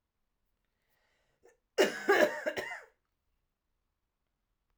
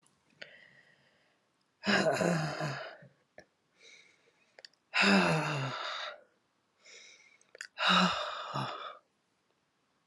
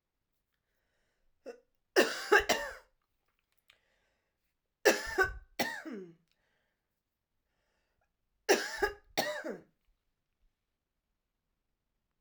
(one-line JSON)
{"cough_length": "4.8 s", "cough_amplitude": 8497, "cough_signal_mean_std_ratio": 0.28, "exhalation_length": "10.1 s", "exhalation_amplitude": 8087, "exhalation_signal_mean_std_ratio": 0.43, "three_cough_length": "12.2 s", "three_cough_amplitude": 12643, "three_cough_signal_mean_std_ratio": 0.27, "survey_phase": "alpha (2021-03-01 to 2021-08-12)", "age": "45-64", "gender": "Female", "wearing_mask": "No", "symptom_cough_any": true, "symptom_new_continuous_cough": true, "symptom_shortness_of_breath": true, "symptom_fatigue": true, "symptom_headache": true, "symptom_change_to_sense_of_smell_or_taste": true, "symptom_loss_of_taste": true, "symptom_onset": "8 days", "smoker_status": "Never smoked", "respiratory_condition_asthma": false, "respiratory_condition_other": false, "recruitment_source": "Test and Trace", "submission_delay": "1 day", "covid_test_result": "Positive", "covid_test_method": "RT-qPCR"}